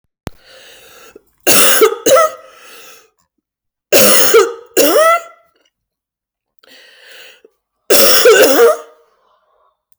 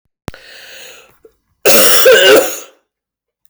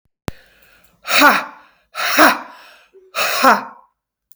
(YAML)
three_cough_length: 10.0 s
three_cough_amplitude: 32768
three_cough_signal_mean_std_ratio: 0.47
cough_length: 3.5 s
cough_amplitude: 32768
cough_signal_mean_std_ratio: 0.48
exhalation_length: 4.4 s
exhalation_amplitude: 32768
exhalation_signal_mean_std_ratio: 0.42
survey_phase: beta (2021-08-13 to 2022-03-07)
age: 45-64
gender: Female
wearing_mask: 'No'
symptom_cough_any: true
symptom_runny_or_blocked_nose: true
symptom_shortness_of_breath: true
symptom_fatigue: true
symptom_headache: true
smoker_status: Never smoked
respiratory_condition_asthma: false
respiratory_condition_other: false
recruitment_source: Test and Trace
submission_delay: 1 day
covid_test_result: Positive
covid_test_method: ePCR